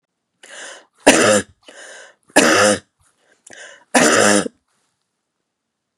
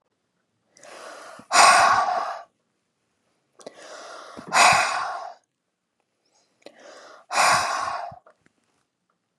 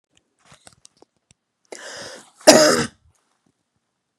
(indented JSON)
{
  "three_cough_length": "6.0 s",
  "three_cough_amplitude": 32768,
  "three_cough_signal_mean_std_ratio": 0.39,
  "exhalation_length": "9.4 s",
  "exhalation_amplitude": 26935,
  "exhalation_signal_mean_std_ratio": 0.38,
  "cough_length": "4.2 s",
  "cough_amplitude": 32768,
  "cough_signal_mean_std_ratio": 0.24,
  "survey_phase": "beta (2021-08-13 to 2022-03-07)",
  "age": "45-64",
  "gender": "Female",
  "wearing_mask": "No",
  "symptom_none": true,
  "symptom_onset": "12 days",
  "smoker_status": "Never smoked",
  "respiratory_condition_asthma": false,
  "respiratory_condition_other": false,
  "recruitment_source": "REACT",
  "submission_delay": "1 day",
  "covid_test_result": "Negative",
  "covid_test_method": "RT-qPCR"
}